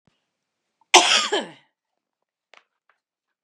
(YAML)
cough_length: 3.4 s
cough_amplitude: 32767
cough_signal_mean_std_ratio: 0.25
survey_phase: beta (2021-08-13 to 2022-03-07)
age: 65+
gender: Female
wearing_mask: 'No'
symptom_none: true
smoker_status: Ex-smoker
respiratory_condition_asthma: false
respiratory_condition_other: false
recruitment_source: REACT
submission_delay: 2 days
covid_test_result: Negative
covid_test_method: RT-qPCR
influenza_a_test_result: Negative
influenza_b_test_result: Negative